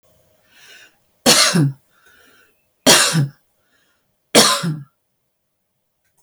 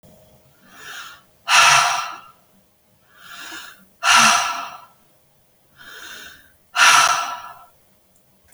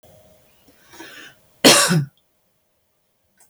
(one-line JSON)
{"three_cough_length": "6.2 s", "three_cough_amplitude": 32768, "three_cough_signal_mean_std_ratio": 0.36, "exhalation_length": "8.5 s", "exhalation_amplitude": 31822, "exhalation_signal_mean_std_ratio": 0.39, "cough_length": "3.5 s", "cough_amplitude": 32767, "cough_signal_mean_std_ratio": 0.28, "survey_phase": "alpha (2021-03-01 to 2021-08-12)", "age": "65+", "gender": "Female", "wearing_mask": "No", "symptom_none": true, "smoker_status": "Ex-smoker", "respiratory_condition_asthma": false, "respiratory_condition_other": false, "recruitment_source": "REACT", "submission_delay": "1 day", "covid_test_result": "Negative", "covid_test_method": "RT-qPCR"}